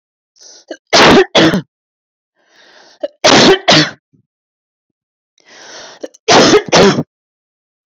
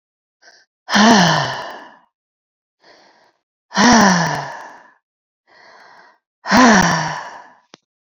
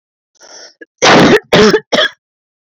{"three_cough_length": "7.9 s", "three_cough_amplitude": 32768, "three_cough_signal_mean_std_ratio": 0.44, "exhalation_length": "8.1 s", "exhalation_amplitude": 29487, "exhalation_signal_mean_std_ratio": 0.42, "cough_length": "2.7 s", "cough_amplitude": 32316, "cough_signal_mean_std_ratio": 0.52, "survey_phase": "beta (2021-08-13 to 2022-03-07)", "age": "18-44", "gender": "Female", "wearing_mask": "No", "symptom_none": true, "smoker_status": "Ex-smoker", "respiratory_condition_asthma": true, "respiratory_condition_other": false, "recruitment_source": "REACT", "submission_delay": "3 days", "covid_test_result": "Negative", "covid_test_method": "RT-qPCR"}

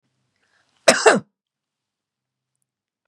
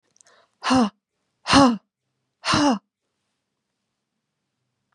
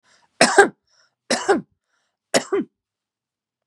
{"cough_length": "3.1 s", "cough_amplitude": 32768, "cough_signal_mean_std_ratio": 0.21, "exhalation_length": "4.9 s", "exhalation_amplitude": 27814, "exhalation_signal_mean_std_ratio": 0.32, "three_cough_length": "3.7 s", "three_cough_amplitude": 32768, "three_cough_signal_mean_std_ratio": 0.31, "survey_phase": "beta (2021-08-13 to 2022-03-07)", "age": "45-64", "gender": "Female", "wearing_mask": "No", "symptom_none": true, "smoker_status": "Never smoked", "respiratory_condition_asthma": true, "respiratory_condition_other": false, "recruitment_source": "REACT", "submission_delay": "1 day", "covid_test_result": "Negative", "covid_test_method": "RT-qPCR", "influenza_a_test_result": "Negative", "influenza_b_test_result": "Negative"}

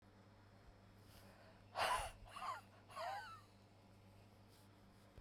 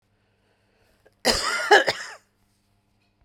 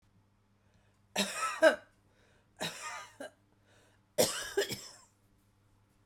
{"exhalation_length": "5.2 s", "exhalation_amplitude": 1349, "exhalation_signal_mean_std_ratio": 0.49, "cough_length": "3.2 s", "cough_amplitude": 25830, "cough_signal_mean_std_ratio": 0.31, "three_cough_length": "6.1 s", "three_cough_amplitude": 9623, "three_cough_signal_mean_std_ratio": 0.32, "survey_phase": "beta (2021-08-13 to 2022-03-07)", "age": "45-64", "gender": "Female", "wearing_mask": "No", "symptom_runny_or_blocked_nose": true, "symptom_sore_throat": true, "symptom_headache": true, "symptom_onset": "3 days", "smoker_status": "Never smoked", "respiratory_condition_asthma": true, "respiratory_condition_other": true, "recruitment_source": "Test and Trace", "submission_delay": "2 days", "covid_test_result": "Positive", "covid_test_method": "RT-qPCR", "covid_ct_value": 20.2, "covid_ct_gene": "ORF1ab gene", "covid_ct_mean": 21.4, "covid_viral_load": "96000 copies/ml", "covid_viral_load_category": "Low viral load (10K-1M copies/ml)"}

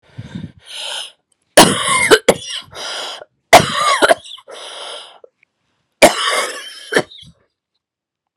{"three_cough_length": "8.4 s", "three_cough_amplitude": 32768, "three_cough_signal_mean_std_ratio": 0.39, "survey_phase": "beta (2021-08-13 to 2022-03-07)", "age": "18-44", "gender": "Female", "wearing_mask": "No", "symptom_cough_any": true, "symptom_runny_or_blocked_nose": true, "symptom_shortness_of_breath": true, "symptom_sore_throat": true, "symptom_abdominal_pain": true, "symptom_diarrhoea": true, "symptom_fatigue": true, "symptom_fever_high_temperature": true, "symptom_headache": true, "symptom_change_to_sense_of_smell_or_taste": true, "symptom_onset": "4 days", "smoker_status": "Ex-smoker", "respiratory_condition_asthma": false, "respiratory_condition_other": false, "recruitment_source": "Test and Trace", "submission_delay": "2 days", "covid_test_result": "Positive", "covid_test_method": "RT-qPCR", "covid_ct_value": 21.4, "covid_ct_gene": "ORF1ab gene", "covid_ct_mean": 21.7, "covid_viral_load": "77000 copies/ml", "covid_viral_load_category": "Low viral load (10K-1M copies/ml)"}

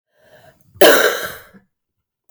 {"cough_length": "2.3 s", "cough_amplitude": 32768, "cough_signal_mean_std_ratio": 0.34, "survey_phase": "beta (2021-08-13 to 2022-03-07)", "age": "45-64", "gender": "Female", "wearing_mask": "No", "symptom_cough_any": true, "symptom_runny_or_blocked_nose": true, "symptom_fatigue": true, "symptom_onset": "4 days", "smoker_status": "Never smoked", "respiratory_condition_asthma": true, "respiratory_condition_other": false, "recruitment_source": "Test and Trace", "submission_delay": "1 day", "covid_test_result": "Negative", "covid_test_method": "RT-qPCR"}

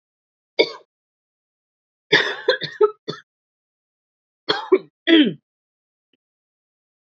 {"cough_length": "7.2 s", "cough_amplitude": 27228, "cough_signal_mean_std_ratio": 0.28, "survey_phase": "beta (2021-08-13 to 2022-03-07)", "age": "18-44", "gender": "Female", "wearing_mask": "No", "symptom_runny_or_blocked_nose": true, "symptom_shortness_of_breath": true, "symptom_sore_throat": true, "symptom_fatigue": true, "symptom_headache": true, "symptom_onset": "6 days", "smoker_status": "Never smoked", "respiratory_condition_asthma": false, "respiratory_condition_other": false, "recruitment_source": "Test and Trace", "submission_delay": "2 days", "covid_test_result": "Positive", "covid_test_method": "RT-qPCR", "covid_ct_value": 15.8, "covid_ct_gene": "ORF1ab gene"}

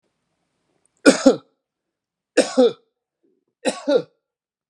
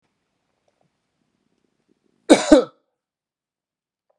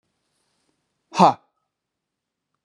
{"three_cough_length": "4.7 s", "three_cough_amplitude": 32767, "three_cough_signal_mean_std_ratio": 0.28, "cough_length": "4.2 s", "cough_amplitude": 32767, "cough_signal_mean_std_ratio": 0.18, "exhalation_length": "2.6 s", "exhalation_amplitude": 31545, "exhalation_signal_mean_std_ratio": 0.19, "survey_phase": "beta (2021-08-13 to 2022-03-07)", "age": "45-64", "gender": "Male", "wearing_mask": "No", "symptom_none": true, "smoker_status": "Ex-smoker", "respiratory_condition_asthma": false, "respiratory_condition_other": false, "recruitment_source": "REACT", "submission_delay": "1 day", "covid_test_result": "Negative", "covid_test_method": "RT-qPCR"}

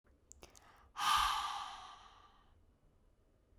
{"exhalation_length": "3.6 s", "exhalation_amplitude": 2951, "exhalation_signal_mean_std_ratio": 0.4, "survey_phase": "beta (2021-08-13 to 2022-03-07)", "age": "18-44", "gender": "Female", "wearing_mask": "No", "symptom_none": true, "symptom_onset": "7 days", "smoker_status": "Current smoker (e-cigarettes or vapes only)", "respiratory_condition_asthma": false, "respiratory_condition_other": false, "recruitment_source": "REACT", "submission_delay": "1 day", "covid_test_result": "Negative", "covid_test_method": "RT-qPCR", "influenza_a_test_result": "Negative", "influenza_b_test_result": "Negative"}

